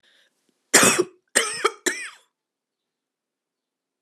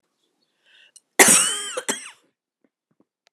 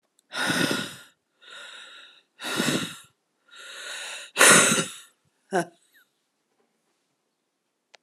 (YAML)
three_cough_length: 4.0 s
three_cough_amplitude: 30674
three_cough_signal_mean_std_ratio: 0.3
cough_length: 3.3 s
cough_amplitude: 32768
cough_signal_mean_std_ratio: 0.29
exhalation_length: 8.0 s
exhalation_amplitude: 30939
exhalation_signal_mean_std_ratio: 0.34
survey_phase: alpha (2021-03-01 to 2021-08-12)
age: 45-64
gender: Female
wearing_mask: 'No'
symptom_cough_any: true
symptom_fatigue: true
symptom_fever_high_temperature: true
symptom_headache: true
symptom_change_to_sense_of_smell_or_taste: true
symptom_loss_of_taste: true
smoker_status: Ex-smoker
respiratory_condition_asthma: false
respiratory_condition_other: false
recruitment_source: Test and Trace
submission_delay: 2 days
covid_test_result: Positive
covid_test_method: RT-qPCR
covid_ct_value: 14.7
covid_ct_gene: ORF1ab gene
covid_ct_mean: 15.0
covid_viral_load: 12000000 copies/ml
covid_viral_load_category: High viral load (>1M copies/ml)